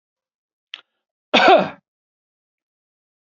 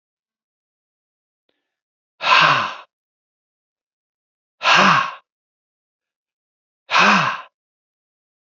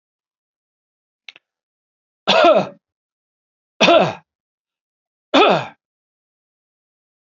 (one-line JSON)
{"cough_length": "3.3 s", "cough_amplitude": 30912, "cough_signal_mean_std_ratio": 0.25, "exhalation_length": "8.4 s", "exhalation_amplitude": 29151, "exhalation_signal_mean_std_ratio": 0.32, "three_cough_length": "7.3 s", "three_cough_amplitude": 30941, "three_cough_signal_mean_std_ratio": 0.29, "survey_phase": "beta (2021-08-13 to 2022-03-07)", "age": "65+", "gender": "Male", "wearing_mask": "No", "symptom_none": true, "symptom_onset": "7 days", "smoker_status": "Never smoked", "respiratory_condition_asthma": false, "respiratory_condition_other": false, "recruitment_source": "REACT", "submission_delay": "3 days", "covid_test_result": "Negative", "covid_test_method": "RT-qPCR"}